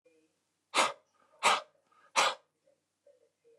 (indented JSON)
{
  "exhalation_length": "3.6 s",
  "exhalation_amplitude": 7537,
  "exhalation_signal_mean_std_ratio": 0.3,
  "survey_phase": "beta (2021-08-13 to 2022-03-07)",
  "age": "45-64",
  "gender": "Male",
  "wearing_mask": "No",
  "symptom_cough_any": true,
  "symptom_shortness_of_breath": true,
  "symptom_abdominal_pain": true,
  "symptom_fatigue": true,
  "smoker_status": "Ex-smoker",
  "respiratory_condition_asthma": false,
  "respiratory_condition_other": false,
  "recruitment_source": "REACT",
  "submission_delay": "1 day",
  "covid_test_result": "Negative",
  "covid_test_method": "RT-qPCR",
  "influenza_a_test_result": "Negative",
  "influenza_b_test_result": "Negative"
}